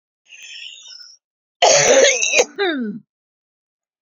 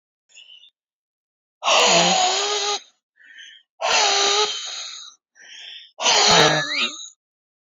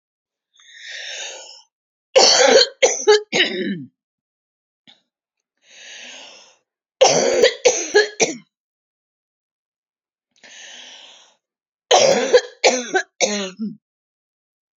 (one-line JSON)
{"cough_length": "4.0 s", "cough_amplitude": 32768, "cough_signal_mean_std_ratio": 0.45, "exhalation_length": "7.8 s", "exhalation_amplitude": 26745, "exhalation_signal_mean_std_ratio": 0.54, "three_cough_length": "14.8 s", "three_cough_amplitude": 32768, "three_cough_signal_mean_std_ratio": 0.38, "survey_phase": "beta (2021-08-13 to 2022-03-07)", "age": "65+", "gender": "Female", "wearing_mask": "No", "symptom_none": true, "smoker_status": "Never smoked", "respiratory_condition_asthma": false, "respiratory_condition_other": false, "recruitment_source": "REACT", "submission_delay": "2 days", "covid_test_result": "Negative", "covid_test_method": "RT-qPCR"}